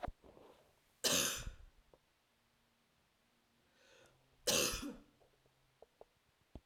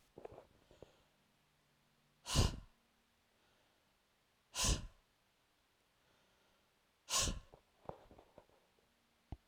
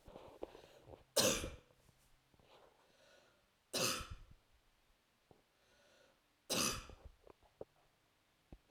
{
  "cough_length": "6.7 s",
  "cough_amplitude": 3261,
  "cough_signal_mean_std_ratio": 0.32,
  "exhalation_length": "9.5 s",
  "exhalation_amplitude": 3584,
  "exhalation_signal_mean_std_ratio": 0.26,
  "three_cough_length": "8.7 s",
  "three_cough_amplitude": 3487,
  "three_cough_signal_mean_std_ratio": 0.31,
  "survey_phase": "alpha (2021-03-01 to 2021-08-12)",
  "age": "45-64",
  "gender": "Female",
  "wearing_mask": "No",
  "symptom_cough_any": true,
  "symptom_fatigue": true,
  "symptom_headache": true,
  "symptom_onset": "3 days",
  "smoker_status": "Never smoked",
  "respiratory_condition_asthma": false,
  "respiratory_condition_other": false,
  "recruitment_source": "Test and Trace",
  "submission_delay": "2 days",
  "covid_test_result": "Positive",
  "covid_test_method": "RT-qPCR"
}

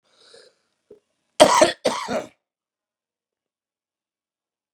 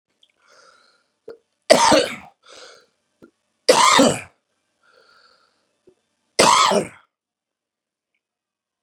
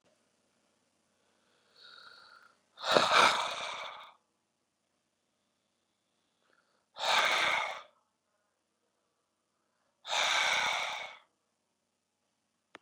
{
  "cough_length": "4.7 s",
  "cough_amplitude": 32656,
  "cough_signal_mean_std_ratio": 0.24,
  "three_cough_length": "8.8 s",
  "three_cough_amplitude": 32768,
  "three_cough_signal_mean_std_ratio": 0.3,
  "exhalation_length": "12.8 s",
  "exhalation_amplitude": 12645,
  "exhalation_signal_mean_std_ratio": 0.34,
  "survey_phase": "beta (2021-08-13 to 2022-03-07)",
  "age": "45-64",
  "gender": "Male",
  "wearing_mask": "No",
  "symptom_none": true,
  "smoker_status": "Current smoker (1 to 10 cigarettes per day)",
  "respiratory_condition_asthma": true,
  "respiratory_condition_other": false,
  "recruitment_source": "REACT",
  "submission_delay": "1 day",
  "covid_test_result": "Positive",
  "covid_test_method": "RT-qPCR",
  "covid_ct_value": 28.0,
  "covid_ct_gene": "E gene",
  "influenza_a_test_result": "Negative",
  "influenza_b_test_result": "Negative"
}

